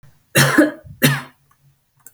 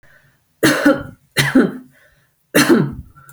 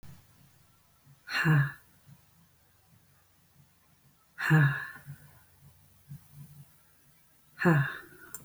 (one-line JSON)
{"cough_length": "2.1 s", "cough_amplitude": 32768, "cough_signal_mean_std_ratio": 0.41, "three_cough_length": "3.3 s", "three_cough_amplitude": 32183, "three_cough_signal_mean_std_ratio": 0.47, "exhalation_length": "8.4 s", "exhalation_amplitude": 8239, "exhalation_signal_mean_std_ratio": 0.34, "survey_phase": "alpha (2021-03-01 to 2021-08-12)", "age": "45-64", "gender": "Female", "wearing_mask": "No", "symptom_none": true, "smoker_status": "Never smoked", "respiratory_condition_asthma": false, "respiratory_condition_other": false, "recruitment_source": "REACT", "submission_delay": "3 days", "covid_test_result": "Negative", "covid_test_method": "RT-qPCR"}